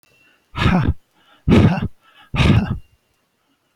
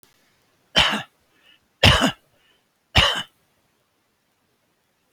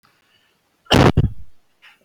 {
  "exhalation_length": "3.8 s",
  "exhalation_amplitude": 29302,
  "exhalation_signal_mean_std_ratio": 0.46,
  "three_cough_length": "5.1 s",
  "three_cough_amplitude": 30369,
  "three_cough_signal_mean_std_ratio": 0.29,
  "cough_length": "2.0 s",
  "cough_amplitude": 27915,
  "cough_signal_mean_std_ratio": 0.34,
  "survey_phase": "beta (2021-08-13 to 2022-03-07)",
  "age": "65+",
  "gender": "Male",
  "wearing_mask": "No",
  "symptom_none": true,
  "smoker_status": "Ex-smoker",
  "respiratory_condition_asthma": false,
  "respiratory_condition_other": true,
  "recruitment_source": "REACT",
  "submission_delay": "5 days",
  "covid_test_result": "Negative",
  "covid_test_method": "RT-qPCR"
}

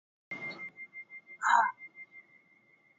{
  "exhalation_length": "3.0 s",
  "exhalation_amplitude": 10076,
  "exhalation_signal_mean_std_ratio": 0.35,
  "survey_phase": "beta (2021-08-13 to 2022-03-07)",
  "age": "45-64",
  "gender": "Female",
  "wearing_mask": "Yes",
  "symptom_none": true,
  "smoker_status": "Ex-smoker",
  "respiratory_condition_asthma": false,
  "respiratory_condition_other": false,
  "recruitment_source": "REACT",
  "submission_delay": "3 days",
  "covid_test_result": "Negative",
  "covid_test_method": "RT-qPCR",
  "influenza_a_test_result": "Negative",
  "influenza_b_test_result": "Negative"
}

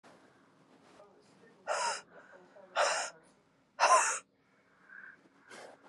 {
  "exhalation_length": "5.9 s",
  "exhalation_amplitude": 8051,
  "exhalation_signal_mean_std_ratio": 0.35,
  "survey_phase": "beta (2021-08-13 to 2022-03-07)",
  "age": "18-44",
  "gender": "Female",
  "wearing_mask": "No",
  "symptom_cough_any": true,
  "symptom_new_continuous_cough": true,
  "symptom_runny_or_blocked_nose": true,
  "symptom_shortness_of_breath": true,
  "symptom_sore_throat": true,
  "symptom_fatigue": true,
  "symptom_onset": "5 days",
  "smoker_status": "Ex-smoker",
  "respiratory_condition_asthma": false,
  "respiratory_condition_other": false,
  "recruitment_source": "REACT",
  "submission_delay": "2 days",
  "covid_test_result": "Negative",
  "covid_test_method": "RT-qPCR",
  "influenza_a_test_result": "Negative",
  "influenza_b_test_result": "Negative"
}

